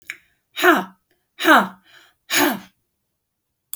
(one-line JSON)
{"exhalation_length": "3.8 s", "exhalation_amplitude": 28903, "exhalation_signal_mean_std_ratio": 0.35, "survey_phase": "beta (2021-08-13 to 2022-03-07)", "age": "65+", "gender": "Female", "wearing_mask": "No", "symptom_none": true, "smoker_status": "Current smoker (1 to 10 cigarettes per day)", "respiratory_condition_asthma": false, "respiratory_condition_other": false, "recruitment_source": "REACT", "submission_delay": "1 day", "covid_test_result": "Negative", "covid_test_method": "RT-qPCR"}